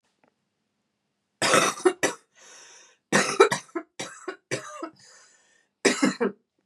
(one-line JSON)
{"cough_length": "6.7 s", "cough_amplitude": 27964, "cough_signal_mean_std_ratio": 0.36, "survey_phase": "beta (2021-08-13 to 2022-03-07)", "age": "45-64", "gender": "Female", "wearing_mask": "No", "symptom_cough_any": true, "symptom_runny_or_blocked_nose": true, "symptom_shortness_of_breath": true, "symptom_sore_throat": true, "symptom_fatigue": true, "symptom_headache": true, "symptom_onset": "3 days", "smoker_status": "Never smoked", "respiratory_condition_asthma": false, "respiratory_condition_other": false, "recruitment_source": "Test and Trace", "submission_delay": "2 days", "covid_test_result": "Positive", "covid_test_method": "RT-qPCR", "covid_ct_value": 24.5, "covid_ct_gene": "N gene"}